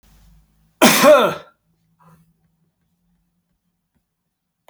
{"cough_length": "4.7 s", "cough_amplitude": 32767, "cough_signal_mean_std_ratio": 0.27, "survey_phase": "beta (2021-08-13 to 2022-03-07)", "age": "45-64", "gender": "Male", "wearing_mask": "No", "symptom_runny_or_blocked_nose": true, "symptom_fatigue": true, "symptom_fever_high_temperature": true, "symptom_onset": "3 days", "smoker_status": "Never smoked", "respiratory_condition_asthma": false, "respiratory_condition_other": false, "recruitment_source": "Test and Trace", "submission_delay": "2 days", "covid_test_result": "Positive", "covid_test_method": "RT-qPCR"}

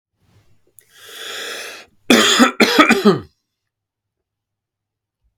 {"cough_length": "5.4 s", "cough_amplitude": 32768, "cough_signal_mean_std_ratio": 0.36, "survey_phase": "beta (2021-08-13 to 2022-03-07)", "age": "18-44", "gender": "Male", "wearing_mask": "No", "symptom_runny_or_blocked_nose": true, "symptom_onset": "12 days", "smoker_status": "Never smoked", "respiratory_condition_asthma": false, "respiratory_condition_other": false, "recruitment_source": "REACT", "submission_delay": "2 days", "covid_test_result": "Negative", "covid_test_method": "RT-qPCR", "influenza_a_test_result": "Negative", "influenza_b_test_result": "Negative"}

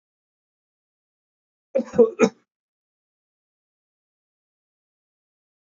{"cough_length": "5.6 s", "cough_amplitude": 21945, "cough_signal_mean_std_ratio": 0.17, "survey_phase": "beta (2021-08-13 to 2022-03-07)", "age": "45-64", "gender": "Male", "wearing_mask": "No", "symptom_runny_or_blocked_nose": true, "symptom_onset": "13 days", "smoker_status": "Never smoked", "respiratory_condition_asthma": false, "respiratory_condition_other": false, "recruitment_source": "REACT", "submission_delay": "17 days", "covid_test_result": "Negative", "covid_test_method": "RT-qPCR", "influenza_a_test_result": "Negative", "influenza_b_test_result": "Negative"}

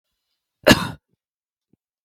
{"cough_length": "2.0 s", "cough_amplitude": 32768, "cough_signal_mean_std_ratio": 0.2, "survey_phase": "beta (2021-08-13 to 2022-03-07)", "age": "18-44", "gender": "Female", "wearing_mask": "No", "symptom_none": true, "symptom_onset": "11 days", "smoker_status": "Never smoked", "respiratory_condition_asthma": true, "respiratory_condition_other": false, "recruitment_source": "REACT", "submission_delay": "4 days", "covid_test_result": "Negative", "covid_test_method": "RT-qPCR", "influenza_a_test_result": "Negative", "influenza_b_test_result": "Negative"}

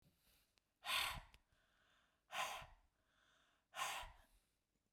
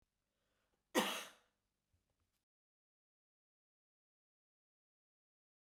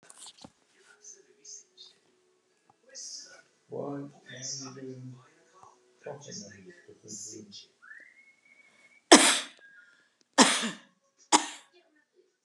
{"exhalation_length": "4.9 s", "exhalation_amplitude": 1236, "exhalation_signal_mean_std_ratio": 0.38, "cough_length": "5.7 s", "cough_amplitude": 2950, "cough_signal_mean_std_ratio": 0.16, "three_cough_length": "12.4 s", "three_cough_amplitude": 32744, "three_cough_signal_mean_std_ratio": 0.23, "survey_phase": "beta (2021-08-13 to 2022-03-07)", "age": "65+", "gender": "Female", "wearing_mask": "No", "symptom_none": true, "smoker_status": "Ex-smoker", "respiratory_condition_asthma": false, "respiratory_condition_other": false, "recruitment_source": "REACT", "submission_delay": "1 day", "covid_test_result": "Negative", "covid_test_method": "RT-qPCR"}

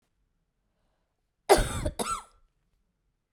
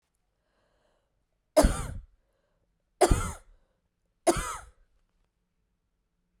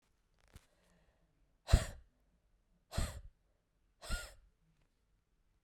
{"cough_length": "3.3 s", "cough_amplitude": 18418, "cough_signal_mean_std_ratio": 0.27, "three_cough_length": "6.4 s", "three_cough_amplitude": 14782, "three_cough_signal_mean_std_ratio": 0.25, "exhalation_length": "5.6 s", "exhalation_amplitude": 7985, "exhalation_signal_mean_std_ratio": 0.2, "survey_phase": "beta (2021-08-13 to 2022-03-07)", "age": "45-64", "gender": "Female", "wearing_mask": "No", "symptom_cough_any": true, "symptom_runny_or_blocked_nose": true, "symptom_sore_throat": true, "symptom_abdominal_pain": true, "symptom_fatigue": true, "symptom_headache": true, "symptom_change_to_sense_of_smell_or_taste": true, "symptom_other": true, "symptom_onset": "5 days", "smoker_status": "Never smoked", "respiratory_condition_asthma": false, "respiratory_condition_other": false, "recruitment_source": "Test and Trace", "submission_delay": "2 days", "covid_test_result": "Positive", "covid_test_method": "RT-qPCR"}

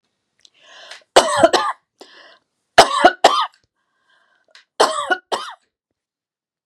{"three_cough_length": "6.7 s", "three_cough_amplitude": 32768, "three_cough_signal_mean_std_ratio": 0.32, "survey_phase": "beta (2021-08-13 to 2022-03-07)", "age": "45-64", "gender": "Female", "wearing_mask": "No", "symptom_none": true, "symptom_onset": "5 days", "smoker_status": "Never smoked", "respiratory_condition_asthma": true, "respiratory_condition_other": false, "recruitment_source": "REACT", "submission_delay": "2 days", "covid_test_result": "Negative", "covid_test_method": "RT-qPCR", "influenza_a_test_result": "Negative", "influenza_b_test_result": "Negative"}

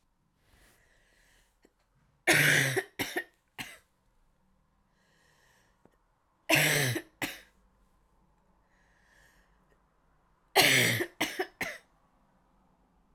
{"three_cough_length": "13.1 s", "three_cough_amplitude": 12541, "three_cough_signal_mean_std_ratio": 0.32, "survey_phase": "alpha (2021-03-01 to 2021-08-12)", "age": "18-44", "gender": "Female", "wearing_mask": "No", "symptom_cough_any": true, "symptom_shortness_of_breath": true, "symptom_fatigue": true, "symptom_change_to_sense_of_smell_or_taste": true, "symptom_loss_of_taste": true, "symptom_onset": "7 days", "smoker_status": "Never smoked", "respiratory_condition_asthma": false, "respiratory_condition_other": false, "recruitment_source": "Test and Trace", "submission_delay": "2 days", "covid_test_result": "Positive", "covid_test_method": "RT-qPCR", "covid_ct_value": 19.0, "covid_ct_gene": "ORF1ab gene", "covid_ct_mean": 19.4, "covid_viral_load": "440000 copies/ml", "covid_viral_load_category": "Low viral load (10K-1M copies/ml)"}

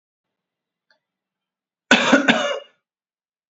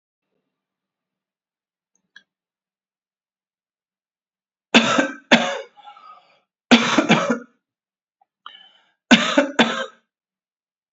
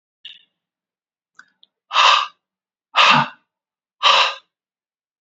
{"cough_length": "3.5 s", "cough_amplitude": 28641, "cough_signal_mean_std_ratio": 0.31, "three_cough_length": "10.9 s", "three_cough_amplitude": 31682, "three_cough_signal_mean_std_ratio": 0.29, "exhalation_length": "5.2 s", "exhalation_amplitude": 29661, "exhalation_signal_mean_std_ratio": 0.34, "survey_phase": "beta (2021-08-13 to 2022-03-07)", "age": "65+", "gender": "Female", "wearing_mask": "No", "symptom_runny_or_blocked_nose": true, "symptom_diarrhoea": true, "symptom_fatigue": true, "symptom_onset": "3 days", "smoker_status": "Ex-smoker", "respiratory_condition_asthma": false, "respiratory_condition_other": false, "recruitment_source": "Test and Trace", "submission_delay": "2 days", "covid_test_result": "Positive", "covid_test_method": "RT-qPCR", "covid_ct_value": 22.9, "covid_ct_gene": "ORF1ab gene", "covid_ct_mean": 23.2, "covid_viral_load": "25000 copies/ml", "covid_viral_load_category": "Low viral load (10K-1M copies/ml)"}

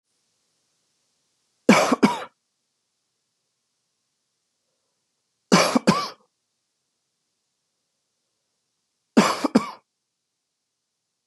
{"three_cough_length": "11.3 s", "three_cough_amplitude": 29313, "three_cough_signal_mean_std_ratio": 0.24, "survey_phase": "beta (2021-08-13 to 2022-03-07)", "age": "45-64", "gender": "Male", "wearing_mask": "No", "symptom_none": true, "smoker_status": "Never smoked", "respiratory_condition_asthma": false, "respiratory_condition_other": false, "recruitment_source": "REACT", "submission_delay": "1 day", "covid_test_result": "Negative", "covid_test_method": "RT-qPCR"}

